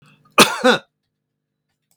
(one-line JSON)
{"cough_length": "2.0 s", "cough_amplitude": 32768, "cough_signal_mean_std_ratio": 0.29, "survey_phase": "beta (2021-08-13 to 2022-03-07)", "age": "65+", "gender": "Male", "wearing_mask": "No", "symptom_none": true, "smoker_status": "Never smoked", "respiratory_condition_asthma": false, "respiratory_condition_other": false, "recruitment_source": "REACT", "submission_delay": "2 days", "covid_test_result": "Negative", "covid_test_method": "RT-qPCR", "influenza_a_test_result": "Negative", "influenza_b_test_result": "Negative"}